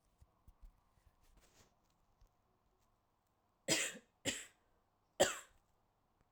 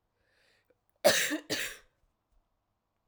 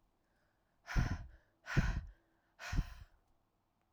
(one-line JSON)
{"three_cough_length": "6.3 s", "three_cough_amplitude": 3921, "three_cough_signal_mean_std_ratio": 0.23, "cough_length": "3.1 s", "cough_amplitude": 10576, "cough_signal_mean_std_ratio": 0.3, "exhalation_length": "3.9 s", "exhalation_amplitude": 3736, "exhalation_signal_mean_std_ratio": 0.37, "survey_phase": "beta (2021-08-13 to 2022-03-07)", "age": "18-44", "gender": "Female", "wearing_mask": "No", "symptom_cough_any": true, "symptom_runny_or_blocked_nose": true, "symptom_headache": true, "symptom_change_to_sense_of_smell_or_taste": true, "symptom_onset": "5 days", "smoker_status": "Never smoked", "respiratory_condition_asthma": false, "respiratory_condition_other": false, "recruitment_source": "Test and Trace", "submission_delay": "2 days", "covid_test_result": "Positive", "covid_test_method": "RT-qPCR"}